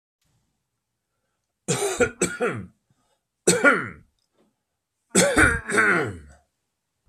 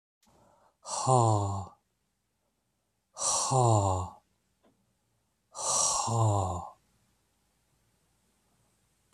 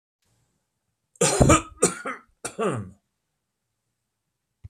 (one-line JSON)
{"three_cough_length": "7.1 s", "three_cough_amplitude": 24760, "three_cough_signal_mean_std_ratio": 0.41, "exhalation_length": "9.1 s", "exhalation_amplitude": 10567, "exhalation_signal_mean_std_ratio": 0.43, "cough_length": "4.7 s", "cough_amplitude": 23090, "cough_signal_mean_std_ratio": 0.31, "survey_phase": "beta (2021-08-13 to 2022-03-07)", "age": "65+", "gender": "Male", "wearing_mask": "No", "symptom_none": true, "smoker_status": "Ex-smoker", "respiratory_condition_asthma": false, "respiratory_condition_other": false, "recruitment_source": "REACT", "submission_delay": "1 day", "covid_test_result": "Negative", "covid_test_method": "RT-qPCR"}